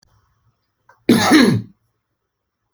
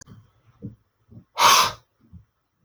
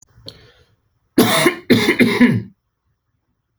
cough_length: 2.7 s
cough_amplitude: 29636
cough_signal_mean_std_ratio: 0.36
exhalation_length: 2.6 s
exhalation_amplitude: 24837
exhalation_signal_mean_std_ratio: 0.3
three_cough_length: 3.6 s
three_cough_amplitude: 29844
three_cough_signal_mean_std_ratio: 0.44
survey_phase: beta (2021-08-13 to 2022-03-07)
age: 18-44
gender: Male
wearing_mask: 'No'
symptom_none: true
symptom_onset: 10 days
smoker_status: Ex-smoker
respiratory_condition_asthma: false
respiratory_condition_other: false
recruitment_source: REACT
submission_delay: 1 day
covid_test_result: Negative
covid_test_method: RT-qPCR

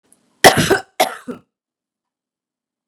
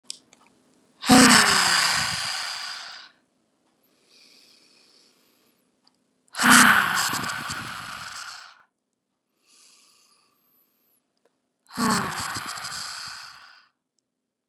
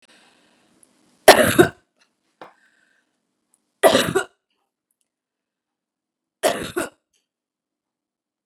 cough_length: 2.9 s
cough_amplitude: 32768
cough_signal_mean_std_ratio: 0.27
exhalation_length: 14.5 s
exhalation_amplitude: 32767
exhalation_signal_mean_std_ratio: 0.35
three_cough_length: 8.5 s
three_cough_amplitude: 32768
three_cough_signal_mean_std_ratio: 0.22
survey_phase: beta (2021-08-13 to 2022-03-07)
age: 45-64
gender: Female
wearing_mask: 'No'
symptom_none: true
smoker_status: Ex-smoker
respiratory_condition_asthma: false
respiratory_condition_other: false
recruitment_source: REACT
submission_delay: 8 days
covid_test_result: Negative
covid_test_method: RT-qPCR
influenza_a_test_result: Negative
influenza_b_test_result: Negative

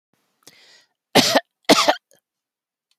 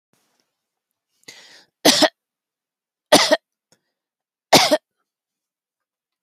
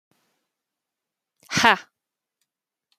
cough_length: 3.0 s
cough_amplitude: 30763
cough_signal_mean_std_ratio: 0.3
three_cough_length: 6.2 s
three_cough_amplitude: 32767
three_cough_signal_mean_std_ratio: 0.25
exhalation_length: 3.0 s
exhalation_amplitude: 27222
exhalation_signal_mean_std_ratio: 0.19
survey_phase: alpha (2021-03-01 to 2021-08-12)
age: 45-64
gender: Female
wearing_mask: 'No'
symptom_none: true
smoker_status: Never smoked
respiratory_condition_asthma: true
respiratory_condition_other: false
recruitment_source: REACT
submission_delay: 1 day
covid_test_result: Negative
covid_test_method: RT-qPCR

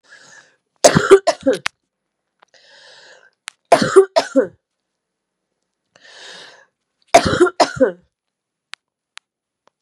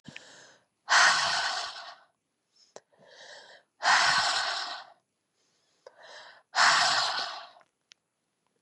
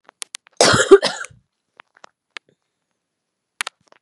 three_cough_length: 9.8 s
three_cough_amplitude: 32768
three_cough_signal_mean_std_ratio: 0.29
exhalation_length: 8.6 s
exhalation_amplitude: 14266
exhalation_signal_mean_std_ratio: 0.44
cough_length: 4.0 s
cough_amplitude: 32768
cough_signal_mean_std_ratio: 0.24
survey_phase: beta (2021-08-13 to 2022-03-07)
age: 45-64
gender: Female
wearing_mask: 'No'
symptom_cough_any: true
symptom_runny_or_blocked_nose: true
symptom_shortness_of_breath: true
symptom_fatigue: true
symptom_headache: true
symptom_change_to_sense_of_smell_or_taste: true
symptom_loss_of_taste: true
symptom_onset: 4 days
smoker_status: Never smoked
respiratory_condition_asthma: false
respiratory_condition_other: false
recruitment_source: Test and Trace
submission_delay: 3 days
covid_test_result: Positive
covid_test_method: RT-qPCR
covid_ct_value: 14.7
covid_ct_gene: ORF1ab gene
covid_ct_mean: 15.2
covid_viral_load: 11000000 copies/ml
covid_viral_load_category: High viral load (>1M copies/ml)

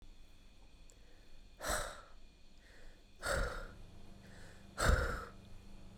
exhalation_length: 6.0 s
exhalation_amplitude: 4785
exhalation_signal_mean_std_ratio: 0.5
survey_phase: beta (2021-08-13 to 2022-03-07)
age: 18-44
gender: Female
wearing_mask: 'Yes'
symptom_none: true
smoker_status: Never smoked
respiratory_condition_asthma: false
respiratory_condition_other: false
recruitment_source: REACT
submission_delay: 0 days
covid_test_result: Negative
covid_test_method: RT-qPCR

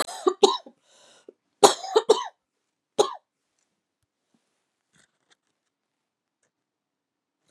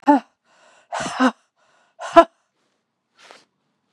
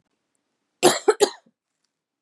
three_cough_length: 7.5 s
three_cough_amplitude: 31438
three_cough_signal_mean_std_ratio: 0.2
exhalation_length: 3.9 s
exhalation_amplitude: 32768
exhalation_signal_mean_std_ratio: 0.25
cough_length: 2.2 s
cough_amplitude: 28646
cough_signal_mean_std_ratio: 0.26
survey_phase: beta (2021-08-13 to 2022-03-07)
age: 45-64
gender: Female
wearing_mask: 'No'
symptom_cough_any: true
symptom_runny_or_blocked_nose: true
symptom_sore_throat: true
symptom_diarrhoea: true
symptom_fever_high_temperature: true
symptom_headache: true
symptom_change_to_sense_of_smell_or_taste: true
symptom_onset: 3 days
smoker_status: Never smoked
respiratory_condition_asthma: false
respiratory_condition_other: false
recruitment_source: Test and Trace
submission_delay: 3 days
covid_test_result: Positive
covid_test_method: RT-qPCR
covid_ct_value: 20.6
covid_ct_gene: ORF1ab gene
covid_ct_mean: 21.4
covid_viral_load: 96000 copies/ml
covid_viral_load_category: Low viral load (10K-1M copies/ml)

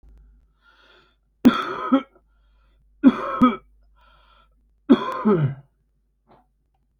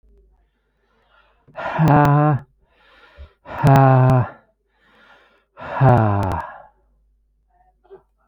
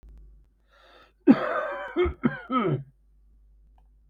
three_cough_length: 7.0 s
three_cough_amplitude: 25870
three_cough_signal_mean_std_ratio: 0.32
exhalation_length: 8.3 s
exhalation_amplitude: 25191
exhalation_signal_mean_std_ratio: 0.45
cough_length: 4.1 s
cough_amplitude: 20080
cough_signal_mean_std_ratio: 0.39
survey_phase: alpha (2021-03-01 to 2021-08-12)
age: 45-64
gender: Male
wearing_mask: 'No'
symptom_none: true
smoker_status: Ex-smoker
respiratory_condition_asthma: false
respiratory_condition_other: false
recruitment_source: REACT
submission_delay: 2 days
covid_test_result: Negative
covid_test_method: RT-qPCR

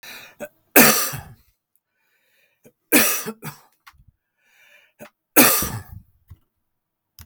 three_cough_length: 7.3 s
three_cough_amplitude: 32768
three_cough_signal_mean_std_ratio: 0.3
survey_phase: beta (2021-08-13 to 2022-03-07)
age: 45-64
gender: Male
wearing_mask: 'No'
symptom_runny_or_blocked_nose: true
symptom_change_to_sense_of_smell_or_taste: true
symptom_loss_of_taste: true
symptom_onset: 5 days
smoker_status: Ex-smoker
respiratory_condition_asthma: false
respiratory_condition_other: false
recruitment_source: Test and Trace
submission_delay: 2 days
covid_test_result: Positive
covid_test_method: ePCR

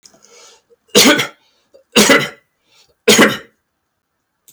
three_cough_length: 4.5 s
three_cough_amplitude: 32768
three_cough_signal_mean_std_ratio: 0.37
survey_phase: beta (2021-08-13 to 2022-03-07)
age: 65+
gender: Male
wearing_mask: 'No'
symptom_none: true
smoker_status: Ex-smoker
respiratory_condition_asthma: false
respiratory_condition_other: false
recruitment_source: REACT
submission_delay: 1 day
covid_test_result: Negative
covid_test_method: RT-qPCR
influenza_a_test_result: Negative
influenza_b_test_result: Negative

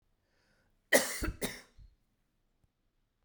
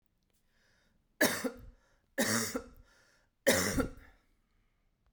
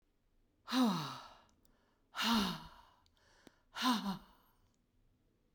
cough_length: 3.2 s
cough_amplitude: 10139
cough_signal_mean_std_ratio: 0.26
three_cough_length: 5.1 s
three_cough_amplitude: 7941
three_cough_signal_mean_std_ratio: 0.37
exhalation_length: 5.5 s
exhalation_amplitude: 2919
exhalation_signal_mean_std_ratio: 0.41
survey_phase: beta (2021-08-13 to 2022-03-07)
age: 45-64
gender: Female
wearing_mask: 'No'
symptom_runny_or_blocked_nose: true
symptom_fatigue: true
symptom_fever_high_temperature: true
smoker_status: Never smoked
respiratory_condition_asthma: false
respiratory_condition_other: false
recruitment_source: Test and Trace
submission_delay: 2 days
covid_test_result: Positive
covid_test_method: RT-qPCR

